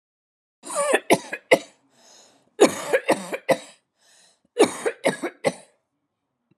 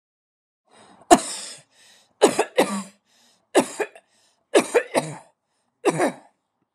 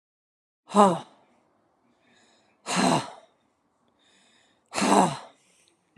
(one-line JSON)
{"three_cough_length": "6.6 s", "three_cough_amplitude": 28738, "three_cough_signal_mean_std_ratio": 0.34, "cough_length": "6.7 s", "cough_amplitude": 32767, "cough_signal_mean_std_ratio": 0.32, "exhalation_length": "6.0 s", "exhalation_amplitude": 21043, "exhalation_signal_mean_std_ratio": 0.31, "survey_phase": "alpha (2021-03-01 to 2021-08-12)", "age": "45-64", "gender": "Female", "wearing_mask": "No", "symptom_none": true, "smoker_status": "Never smoked", "respiratory_condition_asthma": false, "respiratory_condition_other": false, "recruitment_source": "REACT", "submission_delay": "2 days", "covid_test_result": "Negative", "covid_test_method": "RT-qPCR"}